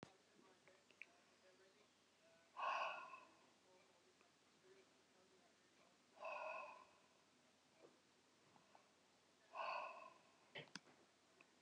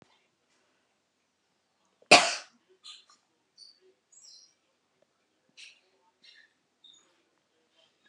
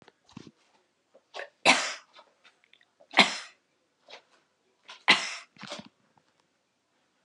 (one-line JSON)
{"exhalation_length": "11.6 s", "exhalation_amplitude": 667, "exhalation_signal_mean_std_ratio": 0.41, "cough_length": "8.1 s", "cough_amplitude": 24492, "cough_signal_mean_std_ratio": 0.13, "three_cough_length": "7.2 s", "three_cough_amplitude": 24202, "three_cough_signal_mean_std_ratio": 0.23, "survey_phase": "alpha (2021-03-01 to 2021-08-12)", "age": "65+", "gender": "Female", "wearing_mask": "No", "symptom_none": true, "smoker_status": "Never smoked", "respiratory_condition_asthma": false, "respiratory_condition_other": false, "recruitment_source": "REACT", "submission_delay": "4 days", "covid_test_result": "Negative", "covid_test_method": "RT-qPCR"}